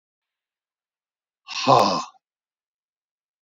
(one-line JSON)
{"exhalation_length": "3.4 s", "exhalation_amplitude": 25167, "exhalation_signal_mean_std_ratio": 0.26, "survey_phase": "beta (2021-08-13 to 2022-03-07)", "age": "65+", "gender": "Male", "wearing_mask": "No", "symptom_cough_any": true, "symptom_runny_or_blocked_nose": true, "smoker_status": "Never smoked", "respiratory_condition_asthma": true, "respiratory_condition_other": false, "recruitment_source": "REACT", "submission_delay": "1 day", "covid_test_result": "Negative", "covid_test_method": "RT-qPCR", "influenza_a_test_result": "Negative", "influenza_b_test_result": "Negative"}